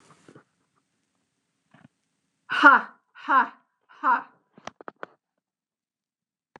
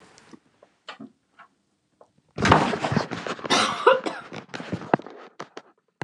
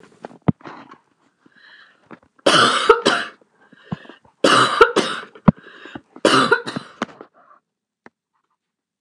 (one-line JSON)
{"exhalation_length": "6.6 s", "exhalation_amplitude": 27172, "exhalation_signal_mean_std_ratio": 0.23, "cough_length": "6.0 s", "cough_amplitude": 29204, "cough_signal_mean_std_ratio": 0.38, "three_cough_length": "9.0 s", "three_cough_amplitude": 29204, "three_cough_signal_mean_std_ratio": 0.35, "survey_phase": "beta (2021-08-13 to 2022-03-07)", "age": "45-64", "gender": "Female", "wearing_mask": "No", "symptom_none": true, "smoker_status": "Never smoked", "respiratory_condition_asthma": true, "respiratory_condition_other": false, "recruitment_source": "REACT", "submission_delay": "2 days", "covid_test_result": "Negative", "covid_test_method": "RT-qPCR", "influenza_a_test_result": "Negative", "influenza_b_test_result": "Negative"}